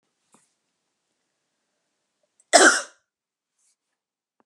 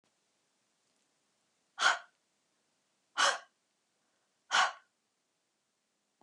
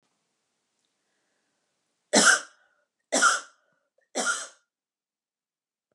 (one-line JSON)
{"cough_length": "4.5 s", "cough_amplitude": 32717, "cough_signal_mean_std_ratio": 0.18, "exhalation_length": "6.2 s", "exhalation_amplitude": 6690, "exhalation_signal_mean_std_ratio": 0.24, "three_cough_length": "5.9 s", "three_cough_amplitude": 21414, "three_cough_signal_mean_std_ratio": 0.27, "survey_phase": "beta (2021-08-13 to 2022-03-07)", "age": "45-64", "gender": "Female", "wearing_mask": "No", "symptom_none": true, "smoker_status": "Never smoked", "respiratory_condition_asthma": false, "respiratory_condition_other": false, "recruitment_source": "REACT", "submission_delay": "1 day", "covid_test_result": "Negative", "covid_test_method": "RT-qPCR", "influenza_a_test_result": "Negative", "influenza_b_test_result": "Negative"}